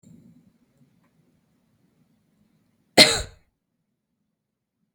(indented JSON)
{
  "cough_length": "4.9 s",
  "cough_amplitude": 32766,
  "cough_signal_mean_std_ratio": 0.15,
  "survey_phase": "beta (2021-08-13 to 2022-03-07)",
  "age": "18-44",
  "gender": "Female",
  "wearing_mask": "No",
  "symptom_none": true,
  "smoker_status": "Never smoked",
  "respiratory_condition_asthma": true,
  "respiratory_condition_other": false,
  "recruitment_source": "REACT",
  "submission_delay": "2 days",
  "covid_test_result": "Negative",
  "covid_test_method": "RT-qPCR",
  "influenza_a_test_result": "Negative",
  "influenza_b_test_result": "Negative"
}